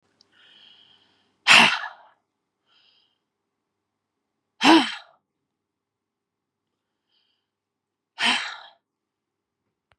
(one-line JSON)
{"exhalation_length": "10.0 s", "exhalation_amplitude": 29743, "exhalation_signal_mean_std_ratio": 0.22, "survey_phase": "beta (2021-08-13 to 2022-03-07)", "age": "45-64", "gender": "Female", "wearing_mask": "Yes", "symptom_new_continuous_cough": true, "symptom_runny_or_blocked_nose": true, "symptom_fatigue": true, "symptom_onset": "2 days", "smoker_status": "Ex-smoker", "respiratory_condition_asthma": false, "respiratory_condition_other": false, "recruitment_source": "Test and Trace", "submission_delay": "1 day", "covid_test_result": "Positive", "covid_test_method": "RT-qPCR", "covid_ct_value": 24.2, "covid_ct_gene": "N gene", "covid_ct_mean": 24.5, "covid_viral_load": "9000 copies/ml", "covid_viral_load_category": "Minimal viral load (< 10K copies/ml)"}